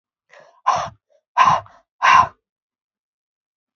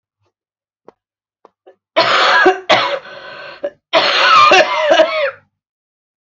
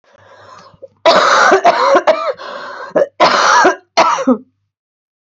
{
  "exhalation_length": "3.8 s",
  "exhalation_amplitude": 27966,
  "exhalation_signal_mean_std_ratio": 0.33,
  "three_cough_length": "6.2 s",
  "three_cough_amplitude": 30138,
  "three_cough_signal_mean_std_ratio": 0.53,
  "cough_length": "5.2 s",
  "cough_amplitude": 31829,
  "cough_signal_mean_std_ratio": 0.61,
  "survey_phase": "beta (2021-08-13 to 2022-03-07)",
  "age": "18-44",
  "gender": "Female",
  "wearing_mask": "No",
  "symptom_cough_any": true,
  "symptom_runny_or_blocked_nose": true,
  "symptom_change_to_sense_of_smell_or_taste": true,
  "symptom_onset": "4 days",
  "smoker_status": "Current smoker (e-cigarettes or vapes only)",
  "respiratory_condition_asthma": false,
  "respiratory_condition_other": false,
  "recruitment_source": "Test and Trace",
  "submission_delay": "2 days",
  "covid_test_result": "Positive",
  "covid_test_method": "ePCR"
}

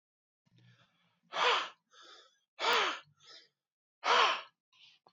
{
  "exhalation_length": "5.1 s",
  "exhalation_amplitude": 6608,
  "exhalation_signal_mean_std_ratio": 0.37,
  "survey_phase": "beta (2021-08-13 to 2022-03-07)",
  "age": "45-64",
  "gender": "Male",
  "wearing_mask": "No",
  "symptom_none": true,
  "smoker_status": "Never smoked",
  "respiratory_condition_asthma": false,
  "respiratory_condition_other": false,
  "recruitment_source": "REACT",
  "submission_delay": "1 day",
  "covid_test_result": "Negative",
  "covid_test_method": "RT-qPCR",
  "influenza_a_test_result": "Negative",
  "influenza_b_test_result": "Negative"
}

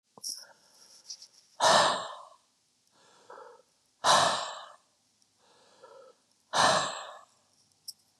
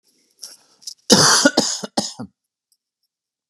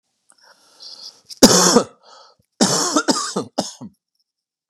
{
  "exhalation_length": "8.2 s",
  "exhalation_amplitude": 11181,
  "exhalation_signal_mean_std_ratio": 0.35,
  "cough_length": "3.5 s",
  "cough_amplitude": 32768,
  "cough_signal_mean_std_ratio": 0.35,
  "three_cough_length": "4.7 s",
  "three_cough_amplitude": 32768,
  "three_cough_signal_mean_std_ratio": 0.38,
  "survey_phase": "beta (2021-08-13 to 2022-03-07)",
  "age": "18-44",
  "gender": "Male",
  "wearing_mask": "No",
  "symptom_none": true,
  "smoker_status": "Never smoked",
  "respiratory_condition_asthma": false,
  "respiratory_condition_other": false,
  "recruitment_source": "REACT",
  "submission_delay": "2 days",
  "covid_test_result": "Negative",
  "covid_test_method": "RT-qPCR",
  "influenza_a_test_result": "Negative",
  "influenza_b_test_result": "Negative"
}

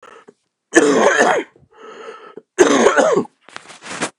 {
  "cough_length": "4.2 s",
  "cough_amplitude": 32768,
  "cough_signal_mean_std_ratio": 0.51,
  "survey_phase": "beta (2021-08-13 to 2022-03-07)",
  "age": "45-64",
  "gender": "Male",
  "wearing_mask": "No",
  "symptom_cough_any": true,
  "symptom_runny_or_blocked_nose": true,
  "symptom_sore_throat": true,
  "symptom_headache": true,
  "symptom_onset": "5 days",
  "smoker_status": "Never smoked",
  "respiratory_condition_asthma": false,
  "respiratory_condition_other": false,
  "recruitment_source": "Test and Trace",
  "submission_delay": "2 days",
  "covid_test_result": "Positive",
  "covid_test_method": "RT-qPCR"
}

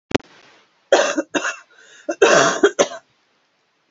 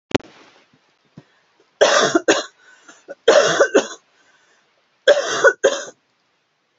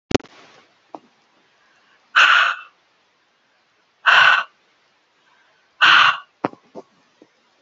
{
  "cough_length": "3.9 s",
  "cough_amplitude": 30781,
  "cough_signal_mean_std_ratio": 0.4,
  "three_cough_length": "6.8 s",
  "three_cough_amplitude": 30557,
  "three_cough_signal_mean_std_ratio": 0.38,
  "exhalation_length": "7.6 s",
  "exhalation_amplitude": 30388,
  "exhalation_signal_mean_std_ratio": 0.32,
  "survey_phase": "alpha (2021-03-01 to 2021-08-12)",
  "age": "45-64",
  "gender": "Female",
  "wearing_mask": "No",
  "symptom_cough_any": true,
  "symptom_new_continuous_cough": true,
  "symptom_shortness_of_breath": true,
  "symptom_fatigue": true,
  "symptom_change_to_sense_of_smell_or_taste": true,
  "symptom_loss_of_taste": true,
  "symptom_onset": "5 days",
  "smoker_status": "Never smoked",
  "respiratory_condition_asthma": false,
  "respiratory_condition_other": false,
  "recruitment_source": "Test and Trace",
  "submission_delay": "2 days",
  "covid_test_result": "Positive",
  "covid_test_method": "RT-qPCR",
  "covid_ct_value": 20.7,
  "covid_ct_gene": "ORF1ab gene",
  "covid_ct_mean": 21.4,
  "covid_viral_load": "97000 copies/ml",
  "covid_viral_load_category": "Low viral load (10K-1M copies/ml)"
}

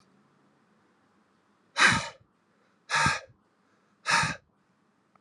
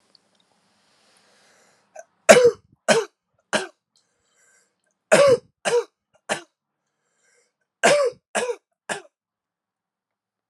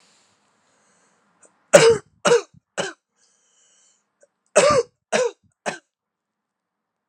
{
  "exhalation_length": "5.2 s",
  "exhalation_amplitude": 15512,
  "exhalation_signal_mean_std_ratio": 0.32,
  "three_cough_length": "10.5 s",
  "three_cough_amplitude": 32768,
  "three_cough_signal_mean_std_ratio": 0.28,
  "cough_length": "7.1 s",
  "cough_amplitude": 32768,
  "cough_signal_mean_std_ratio": 0.28,
  "survey_phase": "alpha (2021-03-01 to 2021-08-12)",
  "age": "18-44",
  "gender": "Male",
  "wearing_mask": "No",
  "symptom_abdominal_pain": true,
  "symptom_fatigue": true,
  "symptom_headache": true,
  "symptom_change_to_sense_of_smell_or_taste": true,
  "symptom_loss_of_taste": true,
  "symptom_onset": "5 days",
  "smoker_status": "Never smoked",
  "respiratory_condition_asthma": false,
  "respiratory_condition_other": false,
  "recruitment_source": "Test and Trace",
  "submission_delay": "2 days",
  "covid_ct_value": 21.6,
  "covid_ct_gene": "ORF1ab gene"
}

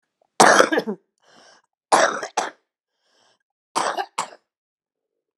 {
  "three_cough_length": "5.4 s",
  "three_cough_amplitude": 32768,
  "three_cough_signal_mean_std_ratio": 0.32,
  "survey_phase": "alpha (2021-03-01 to 2021-08-12)",
  "age": "65+",
  "gender": "Female",
  "wearing_mask": "No",
  "symptom_none": true,
  "smoker_status": "Ex-smoker",
  "respiratory_condition_asthma": true,
  "respiratory_condition_other": false,
  "recruitment_source": "REACT",
  "submission_delay": "3 days",
  "covid_test_result": "Negative",
  "covid_test_method": "RT-qPCR"
}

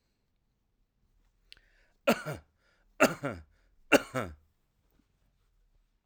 {
  "three_cough_length": "6.1 s",
  "three_cough_amplitude": 14284,
  "three_cough_signal_mean_std_ratio": 0.22,
  "survey_phase": "alpha (2021-03-01 to 2021-08-12)",
  "age": "45-64",
  "gender": "Male",
  "wearing_mask": "No",
  "symptom_none": true,
  "smoker_status": "Never smoked",
  "respiratory_condition_asthma": false,
  "respiratory_condition_other": false,
  "recruitment_source": "REACT",
  "submission_delay": "2 days",
  "covid_test_result": "Negative",
  "covid_test_method": "RT-qPCR"
}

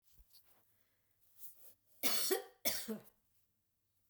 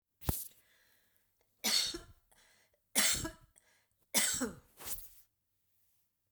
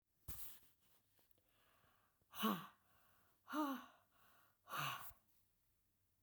{
  "cough_length": "4.1 s",
  "cough_amplitude": 3213,
  "cough_signal_mean_std_ratio": 0.35,
  "three_cough_length": "6.3 s",
  "three_cough_amplitude": 7785,
  "three_cough_signal_mean_std_ratio": 0.37,
  "exhalation_length": "6.2 s",
  "exhalation_amplitude": 1331,
  "exhalation_signal_mean_std_ratio": 0.37,
  "survey_phase": "beta (2021-08-13 to 2022-03-07)",
  "age": "65+",
  "gender": "Female",
  "wearing_mask": "No",
  "symptom_sore_throat": true,
  "symptom_onset": "9 days",
  "smoker_status": "Ex-smoker",
  "respiratory_condition_asthma": false,
  "respiratory_condition_other": false,
  "recruitment_source": "REACT",
  "submission_delay": "1 day",
  "covid_test_result": "Negative",
  "covid_test_method": "RT-qPCR"
}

